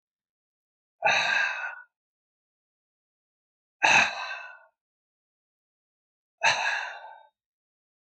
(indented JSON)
{
  "exhalation_length": "8.0 s",
  "exhalation_amplitude": 16099,
  "exhalation_signal_mean_std_ratio": 0.34,
  "survey_phase": "alpha (2021-03-01 to 2021-08-12)",
  "age": "65+",
  "gender": "Male",
  "wearing_mask": "No",
  "symptom_none": true,
  "symptom_shortness_of_breath": true,
  "symptom_headache": true,
  "smoker_status": "Never smoked",
  "respiratory_condition_asthma": true,
  "respiratory_condition_other": false,
  "recruitment_source": "REACT",
  "submission_delay": "2 days",
  "covid_test_result": "Negative",
  "covid_test_method": "RT-qPCR"
}